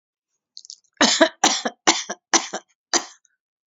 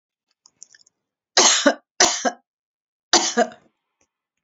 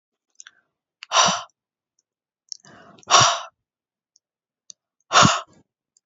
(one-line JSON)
{"cough_length": "3.7 s", "cough_amplitude": 32064, "cough_signal_mean_std_ratio": 0.35, "three_cough_length": "4.4 s", "three_cough_amplitude": 32767, "three_cough_signal_mean_std_ratio": 0.34, "exhalation_length": "6.1 s", "exhalation_amplitude": 31611, "exhalation_signal_mean_std_ratio": 0.28, "survey_phase": "beta (2021-08-13 to 2022-03-07)", "age": "45-64", "gender": "Female", "wearing_mask": "No", "symptom_none": true, "smoker_status": "Never smoked", "respiratory_condition_asthma": false, "respiratory_condition_other": false, "recruitment_source": "Test and Trace", "submission_delay": "0 days", "covid_test_result": "Negative", "covid_test_method": "LFT"}